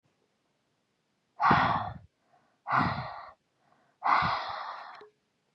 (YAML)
exhalation_length: 5.5 s
exhalation_amplitude: 11410
exhalation_signal_mean_std_ratio: 0.42
survey_phase: beta (2021-08-13 to 2022-03-07)
age: 45-64
gender: Female
wearing_mask: 'No'
symptom_runny_or_blocked_nose: true
symptom_fatigue: true
smoker_status: Ex-smoker
respiratory_condition_asthma: false
respiratory_condition_other: false
recruitment_source: REACT
submission_delay: 2 days
covid_test_result: Negative
covid_test_method: RT-qPCR
influenza_a_test_result: Negative
influenza_b_test_result: Negative